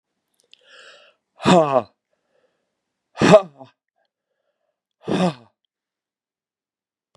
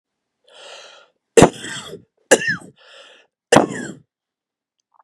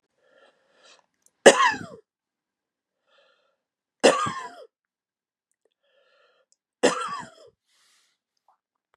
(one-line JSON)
{"exhalation_length": "7.2 s", "exhalation_amplitude": 32767, "exhalation_signal_mean_std_ratio": 0.24, "cough_length": "5.0 s", "cough_amplitude": 32768, "cough_signal_mean_std_ratio": 0.25, "three_cough_length": "9.0 s", "three_cough_amplitude": 32767, "three_cough_signal_mean_std_ratio": 0.21, "survey_phase": "beta (2021-08-13 to 2022-03-07)", "age": "65+", "gender": "Female", "wearing_mask": "No", "symptom_fatigue": true, "symptom_headache": true, "symptom_onset": "13 days", "smoker_status": "Ex-smoker", "respiratory_condition_asthma": false, "respiratory_condition_other": false, "recruitment_source": "REACT", "submission_delay": "1 day", "covid_test_result": "Negative", "covid_test_method": "RT-qPCR", "influenza_a_test_result": "Unknown/Void", "influenza_b_test_result": "Unknown/Void"}